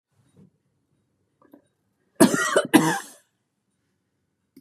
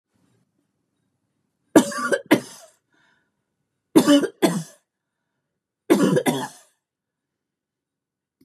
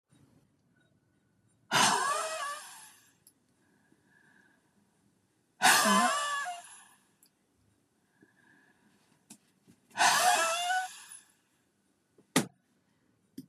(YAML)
cough_length: 4.6 s
cough_amplitude: 31144
cough_signal_mean_std_ratio: 0.27
three_cough_length: 8.4 s
three_cough_amplitude: 31692
three_cough_signal_mean_std_ratio: 0.3
exhalation_length: 13.5 s
exhalation_amplitude: 10458
exhalation_signal_mean_std_ratio: 0.36
survey_phase: beta (2021-08-13 to 2022-03-07)
age: 65+
gender: Female
wearing_mask: 'No'
symptom_none: true
symptom_onset: 12 days
smoker_status: Ex-smoker
respiratory_condition_asthma: false
respiratory_condition_other: false
recruitment_source: REACT
submission_delay: 1 day
covid_test_result: Negative
covid_test_method: RT-qPCR
influenza_a_test_result: Negative
influenza_b_test_result: Negative